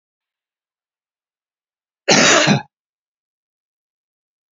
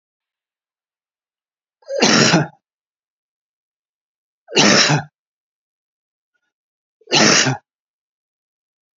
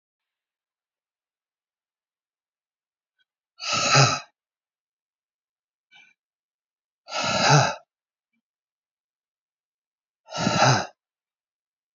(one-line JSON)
{"cough_length": "4.5 s", "cough_amplitude": 30106, "cough_signal_mean_std_ratio": 0.27, "three_cough_length": "9.0 s", "three_cough_amplitude": 32768, "three_cough_signal_mean_std_ratio": 0.32, "exhalation_length": "11.9 s", "exhalation_amplitude": 20901, "exhalation_signal_mean_std_ratio": 0.28, "survey_phase": "beta (2021-08-13 to 2022-03-07)", "age": "65+", "gender": "Male", "wearing_mask": "No", "symptom_none": true, "smoker_status": "Ex-smoker", "respiratory_condition_asthma": false, "respiratory_condition_other": false, "recruitment_source": "REACT", "submission_delay": "1 day", "covid_test_result": "Negative", "covid_test_method": "RT-qPCR", "influenza_a_test_result": "Negative", "influenza_b_test_result": "Negative"}